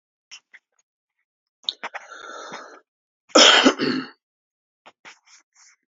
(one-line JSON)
{"cough_length": "5.9 s", "cough_amplitude": 31352, "cough_signal_mean_std_ratio": 0.26, "survey_phase": "beta (2021-08-13 to 2022-03-07)", "age": "45-64", "gender": "Male", "wearing_mask": "No", "symptom_cough_any": true, "symptom_headache": true, "smoker_status": "Ex-smoker", "respiratory_condition_asthma": false, "respiratory_condition_other": false, "recruitment_source": "Test and Trace", "submission_delay": "2 days", "covid_test_result": "Positive", "covid_test_method": "RT-qPCR"}